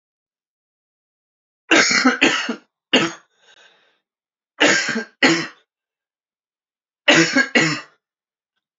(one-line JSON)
{"three_cough_length": "8.8 s", "three_cough_amplitude": 30143, "three_cough_signal_mean_std_ratio": 0.38, "survey_phase": "beta (2021-08-13 to 2022-03-07)", "age": "18-44", "gender": "Male", "wearing_mask": "No", "symptom_fatigue": true, "symptom_fever_high_temperature": true, "symptom_headache": true, "symptom_change_to_sense_of_smell_or_taste": true, "symptom_loss_of_taste": true, "symptom_onset": "3 days", "smoker_status": "Never smoked", "respiratory_condition_asthma": false, "respiratory_condition_other": false, "recruitment_source": "Test and Trace", "submission_delay": "1 day", "covid_test_result": "Positive", "covid_test_method": "RT-qPCR", "covid_ct_value": 18.8, "covid_ct_gene": "ORF1ab gene", "covid_ct_mean": 19.4, "covid_viral_load": "430000 copies/ml", "covid_viral_load_category": "Low viral load (10K-1M copies/ml)"}